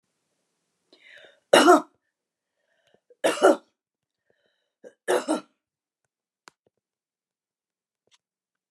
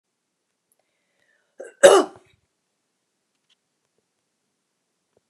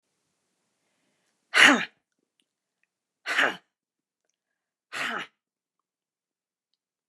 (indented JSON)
{
  "three_cough_length": "8.7 s",
  "three_cough_amplitude": 24503,
  "three_cough_signal_mean_std_ratio": 0.22,
  "cough_length": "5.3 s",
  "cough_amplitude": 29204,
  "cough_signal_mean_std_ratio": 0.15,
  "exhalation_length": "7.1 s",
  "exhalation_amplitude": 26011,
  "exhalation_signal_mean_std_ratio": 0.22,
  "survey_phase": "beta (2021-08-13 to 2022-03-07)",
  "age": "45-64",
  "gender": "Female",
  "wearing_mask": "No",
  "symptom_runny_or_blocked_nose": true,
  "symptom_onset": "11 days",
  "smoker_status": "Never smoked",
  "respiratory_condition_asthma": false,
  "respiratory_condition_other": false,
  "recruitment_source": "REACT",
  "submission_delay": "2 days",
  "covid_test_result": "Negative",
  "covid_test_method": "RT-qPCR",
  "influenza_a_test_result": "Negative",
  "influenza_b_test_result": "Negative"
}